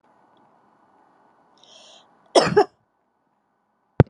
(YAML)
cough_length: 4.1 s
cough_amplitude: 32768
cough_signal_mean_std_ratio: 0.2
survey_phase: alpha (2021-03-01 to 2021-08-12)
age: 65+
gender: Female
wearing_mask: 'No'
symptom_fatigue: true
symptom_headache: true
smoker_status: Never smoked
respiratory_condition_asthma: false
respiratory_condition_other: false
recruitment_source: REACT
submission_delay: 1 day
covid_test_result: Negative
covid_test_method: RT-qPCR